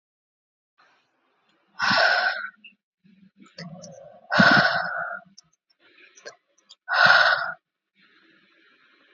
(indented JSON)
{
  "exhalation_length": "9.1 s",
  "exhalation_amplitude": 26427,
  "exhalation_signal_mean_std_ratio": 0.37,
  "survey_phase": "alpha (2021-03-01 to 2021-08-12)",
  "age": "18-44",
  "gender": "Female",
  "wearing_mask": "No",
  "symptom_cough_any": true,
  "symptom_fever_high_temperature": true,
  "symptom_headache": true,
  "symptom_change_to_sense_of_smell_or_taste": true,
  "symptom_loss_of_taste": true,
  "symptom_onset": "3 days",
  "smoker_status": "Never smoked",
  "respiratory_condition_asthma": false,
  "respiratory_condition_other": false,
  "recruitment_source": "Test and Trace",
  "submission_delay": "1 day",
  "covid_test_result": "Positive",
  "covid_test_method": "RT-qPCR"
}